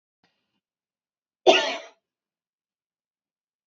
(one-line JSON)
{"cough_length": "3.7 s", "cough_amplitude": 26422, "cough_signal_mean_std_ratio": 0.19, "survey_phase": "beta (2021-08-13 to 2022-03-07)", "age": "18-44", "gender": "Female", "wearing_mask": "No", "symptom_none": true, "smoker_status": "Never smoked", "respiratory_condition_asthma": false, "respiratory_condition_other": false, "recruitment_source": "REACT", "submission_delay": "2 days", "covid_test_result": "Negative", "covid_test_method": "RT-qPCR", "influenza_a_test_result": "Negative", "influenza_b_test_result": "Negative"}